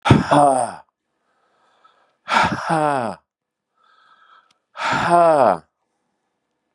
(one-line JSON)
{"exhalation_length": "6.7 s", "exhalation_amplitude": 32746, "exhalation_signal_mean_std_ratio": 0.43, "survey_phase": "beta (2021-08-13 to 2022-03-07)", "age": "65+", "gender": "Male", "wearing_mask": "No", "symptom_cough_any": true, "symptom_runny_or_blocked_nose": true, "symptom_diarrhoea": true, "symptom_fatigue": true, "symptom_fever_high_temperature": true, "symptom_headache": true, "symptom_onset": "3 days", "smoker_status": "Never smoked", "respiratory_condition_asthma": false, "respiratory_condition_other": false, "recruitment_source": "Test and Trace", "submission_delay": "2 days", "covid_test_result": "Positive", "covid_test_method": "RT-qPCR", "covid_ct_value": 15.6, "covid_ct_gene": "ORF1ab gene", "covid_ct_mean": 16.2, "covid_viral_load": "5000000 copies/ml", "covid_viral_load_category": "High viral load (>1M copies/ml)"}